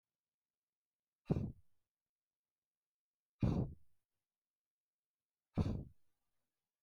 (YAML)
exhalation_length: 6.8 s
exhalation_amplitude: 3108
exhalation_signal_mean_std_ratio: 0.26
survey_phase: beta (2021-08-13 to 2022-03-07)
age: 45-64
gender: Male
wearing_mask: 'No'
symptom_cough_any: true
symptom_fatigue: true
symptom_onset: 10 days
smoker_status: Never smoked
respiratory_condition_asthma: false
respiratory_condition_other: false
recruitment_source: REACT
submission_delay: 1 day
covid_test_result: Negative
covid_test_method: RT-qPCR
influenza_a_test_result: Unknown/Void
influenza_b_test_result: Unknown/Void